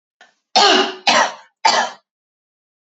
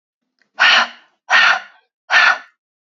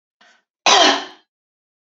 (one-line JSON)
{"three_cough_length": "2.8 s", "three_cough_amplitude": 31495, "three_cough_signal_mean_std_ratio": 0.45, "exhalation_length": "2.8 s", "exhalation_amplitude": 29693, "exhalation_signal_mean_std_ratio": 0.46, "cough_length": "1.9 s", "cough_amplitude": 29821, "cough_signal_mean_std_ratio": 0.36, "survey_phase": "beta (2021-08-13 to 2022-03-07)", "age": "18-44", "gender": "Female", "wearing_mask": "No", "symptom_cough_any": true, "symptom_runny_or_blocked_nose": true, "symptom_sore_throat": true, "symptom_fatigue": true, "symptom_other": true, "symptom_onset": "5 days", "smoker_status": "Never smoked", "respiratory_condition_asthma": false, "respiratory_condition_other": false, "recruitment_source": "Test and Trace", "submission_delay": "1 day", "covid_test_result": "Negative", "covid_test_method": "RT-qPCR"}